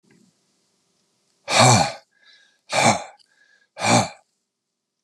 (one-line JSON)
{"exhalation_length": "5.0 s", "exhalation_amplitude": 28027, "exhalation_signal_mean_std_ratio": 0.35, "survey_phase": "beta (2021-08-13 to 2022-03-07)", "age": "65+", "gender": "Male", "wearing_mask": "No", "symptom_cough_any": true, "symptom_sore_throat": true, "symptom_onset": "12 days", "smoker_status": "Never smoked", "respiratory_condition_asthma": false, "respiratory_condition_other": false, "recruitment_source": "REACT", "submission_delay": "1 day", "covid_test_result": "Negative", "covid_test_method": "RT-qPCR"}